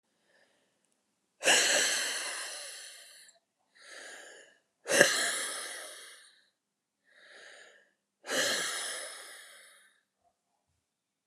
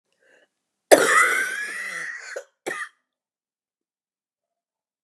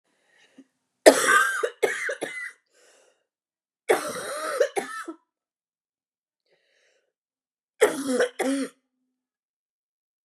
exhalation_length: 11.3 s
exhalation_amplitude: 24593
exhalation_signal_mean_std_ratio: 0.39
cough_length: 5.0 s
cough_amplitude: 32768
cough_signal_mean_std_ratio: 0.33
three_cough_length: 10.2 s
three_cough_amplitude: 32767
three_cough_signal_mean_std_ratio: 0.33
survey_phase: beta (2021-08-13 to 2022-03-07)
age: 45-64
gender: Female
wearing_mask: 'No'
symptom_cough_any: true
symptom_shortness_of_breath: true
symptom_fatigue: true
symptom_headache: true
symptom_onset: 1 day
smoker_status: Never smoked
respiratory_condition_asthma: true
respiratory_condition_other: false
recruitment_source: Test and Trace
submission_delay: 1 day
covid_test_result: Positive
covid_test_method: RT-qPCR
covid_ct_value: 19.5
covid_ct_gene: ORF1ab gene
covid_ct_mean: 19.9
covid_viral_load: 300000 copies/ml
covid_viral_load_category: Low viral load (10K-1M copies/ml)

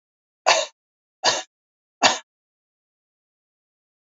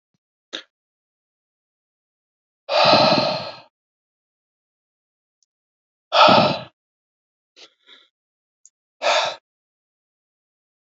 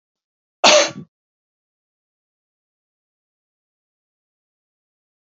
three_cough_length: 4.1 s
three_cough_amplitude: 28200
three_cough_signal_mean_std_ratio: 0.25
exhalation_length: 10.9 s
exhalation_amplitude: 28864
exhalation_signal_mean_std_ratio: 0.28
cough_length: 5.2 s
cough_amplitude: 32767
cough_signal_mean_std_ratio: 0.17
survey_phase: beta (2021-08-13 to 2022-03-07)
age: 18-44
gender: Male
wearing_mask: 'No'
symptom_none: true
smoker_status: Never smoked
respiratory_condition_asthma: false
respiratory_condition_other: false
recruitment_source: REACT
submission_delay: 1 day
covid_test_result: Negative
covid_test_method: RT-qPCR
influenza_a_test_result: Negative
influenza_b_test_result: Negative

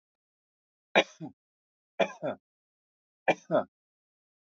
three_cough_length: 4.5 s
three_cough_amplitude: 13941
three_cough_signal_mean_std_ratio: 0.23
survey_phase: alpha (2021-03-01 to 2021-08-12)
age: 45-64
gender: Male
wearing_mask: 'No'
symptom_none: true
smoker_status: Never smoked
respiratory_condition_asthma: true
respiratory_condition_other: false
recruitment_source: REACT
submission_delay: 1 day
covid_test_result: Negative
covid_test_method: RT-qPCR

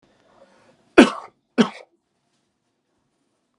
cough_length: 3.6 s
cough_amplitude: 32767
cough_signal_mean_std_ratio: 0.18
survey_phase: alpha (2021-03-01 to 2021-08-12)
age: 18-44
gender: Male
wearing_mask: 'No'
symptom_none: true
smoker_status: Never smoked
respiratory_condition_asthma: false
respiratory_condition_other: false
recruitment_source: REACT
submission_delay: 1 day
covid_test_result: Negative
covid_test_method: RT-qPCR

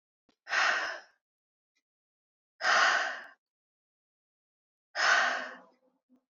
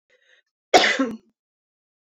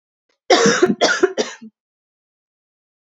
exhalation_length: 6.3 s
exhalation_amplitude: 7285
exhalation_signal_mean_std_ratio: 0.39
cough_length: 2.1 s
cough_amplitude: 29267
cough_signal_mean_std_ratio: 0.3
three_cough_length: 3.2 s
three_cough_amplitude: 29138
three_cough_signal_mean_std_ratio: 0.4
survey_phase: beta (2021-08-13 to 2022-03-07)
age: 18-44
gender: Female
wearing_mask: 'No'
symptom_cough_any: true
symptom_runny_or_blocked_nose: true
symptom_headache: true
symptom_change_to_sense_of_smell_or_taste: true
symptom_other: true
symptom_onset: 3 days
smoker_status: Ex-smoker
respiratory_condition_asthma: false
respiratory_condition_other: false
recruitment_source: Test and Trace
submission_delay: 2 days
covid_test_result: Positive
covid_test_method: ePCR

